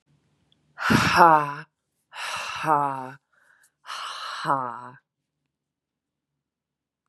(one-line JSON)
{"exhalation_length": "7.1 s", "exhalation_amplitude": 31175, "exhalation_signal_mean_std_ratio": 0.35, "survey_phase": "beta (2021-08-13 to 2022-03-07)", "age": "18-44", "gender": "Female", "wearing_mask": "No", "symptom_sore_throat": true, "symptom_fatigue": true, "smoker_status": "Current smoker (e-cigarettes or vapes only)", "respiratory_condition_asthma": false, "respiratory_condition_other": false, "recruitment_source": "Test and Trace", "submission_delay": "1 day", "covid_test_result": "Positive", "covid_test_method": "RT-qPCR", "covid_ct_value": 19.3, "covid_ct_gene": "N gene", "covid_ct_mean": 20.0, "covid_viral_load": "270000 copies/ml", "covid_viral_load_category": "Low viral load (10K-1M copies/ml)"}